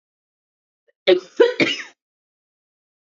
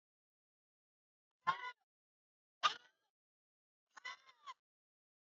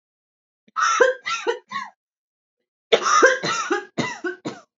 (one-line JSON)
{"cough_length": "3.2 s", "cough_amplitude": 26077, "cough_signal_mean_std_ratio": 0.28, "exhalation_length": "5.3 s", "exhalation_amplitude": 3708, "exhalation_signal_mean_std_ratio": 0.18, "three_cough_length": "4.8 s", "three_cough_amplitude": 27890, "three_cough_signal_mean_std_ratio": 0.47, "survey_phase": "beta (2021-08-13 to 2022-03-07)", "age": "18-44", "gender": "Female", "wearing_mask": "No", "symptom_cough_any": true, "symptom_runny_or_blocked_nose": true, "symptom_sore_throat": true, "symptom_fatigue": true, "symptom_headache": true, "symptom_onset": "2 days", "smoker_status": "Current smoker (e-cigarettes or vapes only)", "respiratory_condition_asthma": false, "respiratory_condition_other": false, "recruitment_source": "Test and Trace", "submission_delay": "2 days", "covid_test_result": "Positive", "covid_test_method": "RT-qPCR", "covid_ct_value": 32.9, "covid_ct_gene": "ORF1ab gene", "covid_ct_mean": 33.8, "covid_viral_load": "8.3 copies/ml", "covid_viral_load_category": "Minimal viral load (< 10K copies/ml)"}